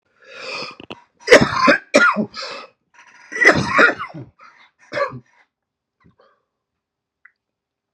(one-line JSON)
{"three_cough_length": "7.9 s", "three_cough_amplitude": 32768, "three_cough_signal_mean_std_ratio": 0.35, "survey_phase": "beta (2021-08-13 to 2022-03-07)", "age": "18-44", "gender": "Male", "wearing_mask": "No", "symptom_shortness_of_breath": true, "symptom_fatigue": true, "symptom_onset": "12 days", "smoker_status": "Never smoked", "respiratory_condition_asthma": false, "respiratory_condition_other": false, "recruitment_source": "REACT", "submission_delay": "2 days", "covid_test_result": "Negative", "covid_test_method": "RT-qPCR", "influenza_a_test_result": "Negative", "influenza_b_test_result": "Negative"}